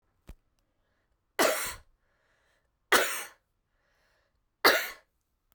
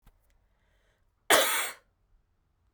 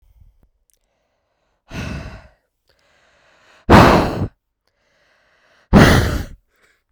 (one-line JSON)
{"three_cough_length": "5.5 s", "three_cough_amplitude": 20022, "three_cough_signal_mean_std_ratio": 0.28, "cough_length": "2.7 s", "cough_amplitude": 19959, "cough_signal_mean_std_ratio": 0.29, "exhalation_length": "6.9 s", "exhalation_amplitude": 32768, "exhalation_signal_mean_std_ratio": 0.31, "survey_phase": "beta (2021-08-13 to 2022-03-07)", "age": "18-44", "gender": "Female", "wearing_mask": "No", "symptom_cough_any": true, "symptom_runny_or_blocked_nose": true, "symptom_change_to_sense_of_smell_or_taste": true, "smoker_status": "Never smoked", "respiratory_condition_asthma": false, "respiratory_condition_other": false, "recruitment_source": "Test and Trace", "submission_delay": "2 days", "covid_test_result": "Positive", "covid_test_method": "RT-qPCR", "covid_ct_value": 20.9, "covid_ct_gene": "ORF1ab gene"}